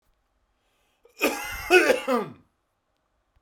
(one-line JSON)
{"cough_length": "3.4 s", "cough_amplitude": 20793, "cough_signal_mean_std_ratio": 0.36, "survey_phase": "beta (2021-08-13 to 2022-03-07)", "age": "45-64", "gender": "Male", "wearing_mask": "No", "symptom_none": true, "smoker_status": "Ex-smoker", "respiratory_condition_asthma": false, "respiratory_condition_other": false, "recruitment_source": "REACT", "submission_delay": "2 days", "covid_test_result": "Negative", "covid_test_method": "RT-qPCR"}